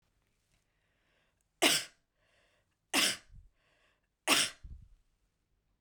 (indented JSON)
{
  "three_cough_length": "5.8 s",
  "three_cough_amplitude": 9694,
  "three_cough_signal_mean_std_ratio": 0.27,
  "survey_phase": "beta (2021-08-13 to 2022-03-07)",
  "age": "45-64",
  "gender": "Female",
  "wearing_mask": "No",
  "symptom_none": true,
  "smoker_status": "Never smoked",
  "respiratory_condition_asthma": false,
  "respiratory_condition_other": false,
  "recruitment_source": "REACT",
  "submission_delay": "1 day",
  "covid_test_method": "RT-qPCR",
  "influenza_a_test_result": "Unknown/Void",
  "influenza_b_test_result": "Unknown/Void"
}